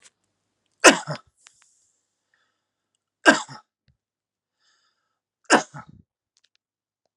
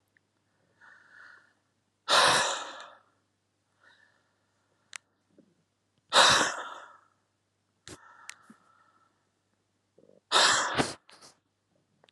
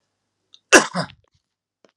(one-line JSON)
{"three_cough_length": "7.2 s", "three_cough_amplitude": 32768, "three_cough_signal_mean_std_ratio": 0.17, "exhalation_length": "12.1 s", "exhalation_amplitude": 14890, "exhalation_signal_mean_std_ratio": 0.29, "cough_length": "2.0 s", "cough_amplitude": 32768, "cough_signal_mean_std_ratio": 0.21, "survey_phase": "beta (2021-08-13 to 2022-03-07)", "age": "45-64", "gender": "Male", "wearing_mask": "No", "symptom_none": true, "smoker_status": "Never smoked", "respiratory_condition_asthma": false, "respiratory_condition_other": false, "recruitment_source": "Test and Trace", "submission_delay": "0 days", "covid_test_result": "Negative", "covid_test_method": "RT-qPCR"}